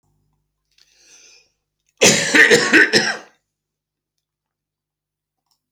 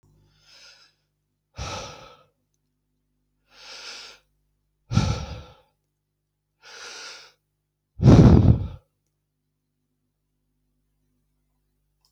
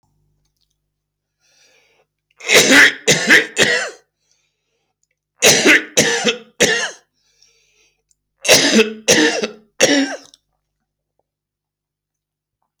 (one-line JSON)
{"cough_length": "5.7 s", "cough_amplitude": 30357, "cough_signal_mean_std_ratio": 0.33, "exhalation_length": "12.1 s", "exhalation_amplitude": 28238, "exhalation_signal_mean_std_ratio": 0.22, "three_cough_length": "12.8 s", "three_cough_amplitude": 31871, "three_cough_signal_mean_std_ratio": 0.4, "survey_phase": "beta (2021-08-13 to 2022-03-07)", "age": "45-64", "gender": "Male", "wearing_mask": "No", "symptom_runny_or_blocked_nose": true, "symptom_sore_throat": true, "symptom_fever_high_temperature": true, "symptom_headache": true, "smoker_status": "Never smoked", "respiratory_condition_asthma": false, "respiratory_condition_other": false, "recruitment_source": "Test and Trace", "submission_delay": "2 days", "covid_test_result": "Positive", "covid_test_method": "RT-qPCR", "covid_ct_value": 18.1, "covid_ct_gene": "ORF1ab gene", "covid_ct_mean": 18.3, "covid_viral_load": "990000 copies/ml", "covid_viral_load_category": "Low viral load (10K-1M copies/ml)"}